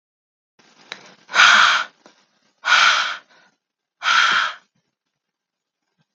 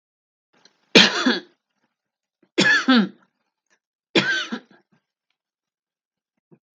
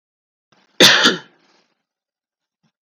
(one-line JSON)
{"exhalation_length": "6.1 s", "exhalation_amplitude": 32768, "exhalation_signal_mean_std_ratio": 0.39, "three_cough_length": "6.7 s", "three_cough_amplitude": 32768, "three_cough_signal_mean_std_ratio": 0.31, "cough_length": "2.8 s", "cough_amplitude": 32768, "cough_signal_mean_std_ratio": 0.27, "survey_phase": "beta (2021-08-13 to 2022-03-07)", "age": "45-64", "gender": "Female", "wearing_mask": "No", "symptom_none": true, "smoker_status": "Never smoked", "respiratory_condition_asthma": true, "respiratory_condition_other": false, "recruitment_source": "REACT", "submission_delay": "2 days", "covid_test_result": "Negative", "covid_test_method": "RT-qPCR", "influenza_a_test_result": "Negative", "influenza_b_test_result": "Negative"}